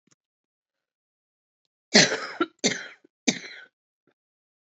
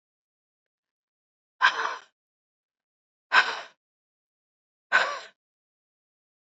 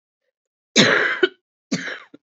{"three_cough_length": "4.8 s", "three_cough_amplitude": 28946, "three_cough_signal_mean_std_ratio": 0.24, "exhalation_length": "6.5 s", "exhalation_amplitude": 21259, "exhalation_signal_mean_std_ratio": 0.24, "cough_length": "2.4 s", "cough_amplitude": 28976, "cough_signal_mean_std_ratio": 0.39, "survey_phase": "beta (2021-08-13 to 2022-03-07)", "age": "45-64", "gender": "Female", "wearing_mask": "No", "symptom_cough_any": true, "symptom_new_continuous_cough": true, "symptom_runny_or_blocked_nose": true, "symptom_shortness_of_breath": true, "symptom_sore_throat": true, "symptom_abdominal_pain": true, "symptom_diarrhoea": true, "symptom_fatigue": true, "symptom_fever_high_temperature": true, "symptom_headache": true, "symptom_change_to_sense_of_smell_or_taste": true, "symptom_other": true, "symptom_onset": "5 days", "smoker_status": "Ex-smoker", "respiratory_condition_asthma": true, "respiratory_condition_other": false, "recruitment_source": "Test and Trace", "submission_delay": "1 day", "covid_test_result": "Positive", "covid_test_method": "RT-qPCR", "covid_ct_value": 19.0, "covid_ct_gene": "N gene"}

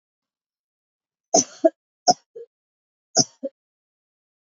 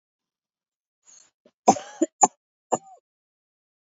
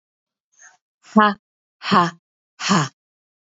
{"three_cough_length": "4.5 s", "three_cough_amplitude": 26623, "three_cough_signal_mean_std_ratio": 0.2, "cough_length": "3.8 s", "cough_amplitude": 27962, "cough_signal_mean_std_ratio": 0.18, "exhalation_length": "3.6 s", "exhalation_amplitude": 28124, "exhalation_signal_mean_std_ratio": 0.32, "survey_phase": "beta (2021-08-13 to 2022-03-07)", "age": "45-64", "gender": "Female", "wearing_mask": "No", "symptom_none": true, "symptom_onset": "12 days", "smoker_status": "Never smoked", "respiratory_condition_asthma": false, "respiratory_condition_other": false, "recruitment_source": "REACT", "submission_delay": "0 days", "covid_test_result": "Negative", "covid_test_method": "RT-qPCR"}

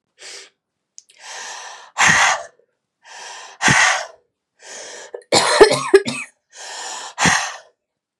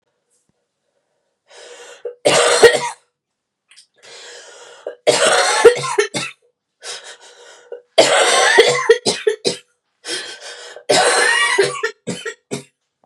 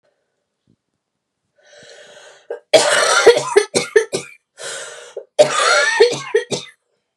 {"exhalation_length": "8.2 s", "exhalation_amplitude": 32768, "exhalation_signal_mean_std_ratio": 0.41, "three_cough_length": "13.1 s", "three_cough_amplitude": 32768, "three_cough_signal_mean_std_ratio": 0.46, "cough_length": "7.2 s", "cough_amplitude": 32768, "cough_signal_mean_std_ratio": 0.43, "survey_phase": "beta (2021-08-13 to 2022-03-07)", "age": "18-44", "gender": "Female", "wearing_mask": "No", "symptom_cough_any": true, "symptom_runny_or_blocked_nose": true, "symptom_shortness_of_breath": true, "symptom_sore_throat": true, "symptom_abdominal_pain": true, "symptom_diarrhoea": true, "symptom_fatigue": true, "symptom_fever_high_temperature": true, "symptom_headache": true, "symptom_onset": "4 days", "smoker_status": "Never smoked", "respiratory_condition_asthma": false, "respiratory_condition_other": false, "recruitment_source": "Test and Trace", "submission_delay": "2 days", "covid_test_result": "Positive", "covid_test_method": "RT-qPCR", "covid_ct_value": 19.4, "covid_ct_gene": "ORF1ab gene", "covid_ct_mean": 19.9, "covid_viral_load": "300000 copies/ml", "covid_viral_load_category": "Low viral load (10K-1M copies/ml)"}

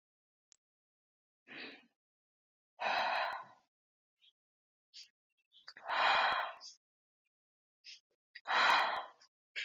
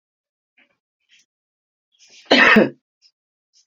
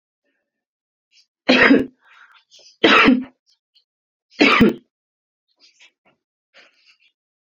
{"exhalation_length": "9.6 s", "exhalation_amplitude": 5120, "exhalation_signal_mean_std_ratio": 0.37, "cough_length": "3.7 s", "cough_amplitude": 28668, "cough_signal_mean_std_ratio": 0.26, "three_cough_length": "7.4 s", "three_cough_amplitude": 28938, "three_cough_signal_mean_std_ratio": 0.31, "survey_phase": "beta (2021-08-13 to 2022-03-07)", "age": "18-44", "gender": "Female", "wearing_mask": "No", "symptom_diarrhoea": true, "symptom_fatigue": true, "symptom_onset": "12 days", "smoker_status": "Current smoker (11 or more cigarettes per day)", "respiratory_condition_asthma": true, "respiratory_condition_other": false, "recruitment_source": "REACT", "submission_delay": "3 days", "covid_test_result": "Negative", "covid_test_method": "RT-qPCR"}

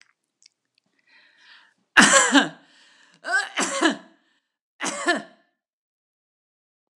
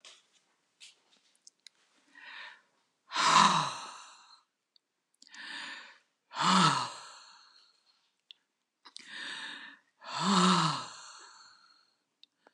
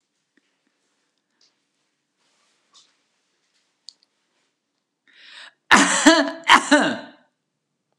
{"three_cough_length": "7.0 s", "three_cough_amplitude": 32767, "three_cough_signal_mean_std_ratio": 0.31, "exhalation_length": "12.5 s", "exhalation_amplitude": 11790, "exhalation_signal_mean_std_ratio": 0.35, "cough_length": "8.0 s", "cough_amplitude": 32768, "cough_signal_mean_std_ratio": 0.26, "survey_phase": "beta (2021-08-13 to 2022-03-07)", "age": "65+", "gender": "Female", "wearing_mask": "No", "symptom_none": true, "smoker_status": "Never smoked", "respiratory_condition_asthma": false, "respiratory_condition_other": false, "recruitment_source": "REACT", "submission_delay": "3 days", "covid_test_result": "Negative", "covid_test_method": "RT-qPCR"}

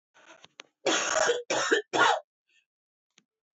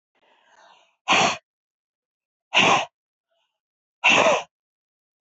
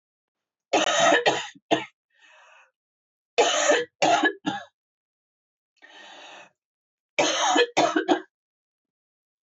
{"cough_length": "3.6 s", "cough_amplitude": 9377, "cough_signal_mean_std_ratio": 0.46, "exhalation_length": "5.2 s", "exhalation_amplitude": 20020, "exhalation_signal_mean_std_ratio": 0.35, "three_cough_length": "9.6 s", "three_cough_amplitude": 14621, "three_cough_signal_mean_std_ratio": 0.43, "survey_phase": "beta (2021-08-13 to 2022-03-07)", "age": "45-64", "gender": "Female", "wearing_mask": "No", "symptom_cough_any": true, "smoker_status": "Never smoked", "respiratory_condition_asthma": false, "respiratory_condition_other": false, "recruitment_source": "REACT", "submission_delay": "1 day", "covid_test_result": "Negative", "covid_test_method": "RT-qPCR"}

